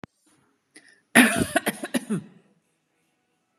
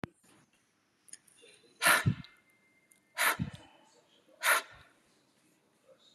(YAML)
cough_length: 3.6 s
cough_amplitude: 32622
cough_signal_mean_std_ratio: 0.3
exhalation_length: 6.1 s
exhalation_amplitude: 7753
exhalation_signal_mean_std_ratio: 0.29
survey_phase: beta (2021-08-13 to 2022-03-07)
age: 45-64
gender: Female
wearing_mask: 'No'
symptom_none: true
smoker_status: Ex-smoker
respiratory_condition_asthma: false
respiratory_condition_other: false
recruitment_source: REACT
submission_delay: 1 day
covid_test_result: Negative
covid_test_method: RT-qPCR
influenza_a_test_result: Unknown/Void
influenza_b_test_result: Unknown/Void